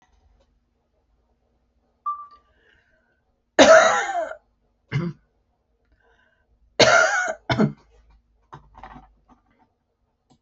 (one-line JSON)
{"cough_length": "10.4 s", "cough_amplitude": 29557, "cough_signal_mean_std_ratio": 0.29, "survey_phase": "alpha (2021-03-01 to 2021-08-12)", "age": "65+", "gender": "Female", "wearing_mask": "No", "symptom_none": true, "smoker_status": "Never smoked", "respiratory_condition_asthma": false, "respiratory_condition_other": false, "recruitment_source": "REACT", "submission_delay": "1 day", "covid_test_result": "Negative", "covid_test_method": "RT-qPCR"}